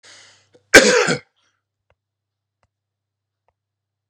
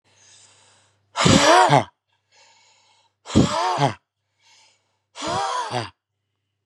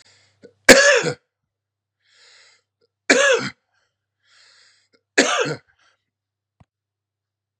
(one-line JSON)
{"cough_length": "4.1 s", "cough_amplitude": 32768, "cough_signal_mean_std_ratio": 0.23, "exhalation_length": "6.7 s", "exhalation_amplitude": 30957, "exhalation_signal_mean_std_ratio": 0.39, "three_cough_length": "7.6 s", "three_cough_amplitude": 32768, "three_cough_signal_mean_std_ratio": 0.28, "survey_phase": "beta (2021-08-13 to 2022-03-07)", "age": "45-64", "gender": "Male", "wearing_mask": "No", "symptom_cough_any": true, "symptom_headache": true, "symptom_other": true, "symptom_onset": "3 days", "smoker_status": "Never smoked", "respiratory_condition_asthma": false, "respiratory_condition_other": false, "recruitment_source": "Test and Trace", "submission_delay": "1 day", "covid_test_result": "Positive", "covid_test_method": "RT-qPCR", "covid_ct_value": 21.2, "covid_ct_gene": "ORF1ab gene", "covid_ct_mean": 21.7, "covid_viral_load": "74000 copies/ml", "covid_viral_load_category": "Low viral load (10K-1M copies/ml)"}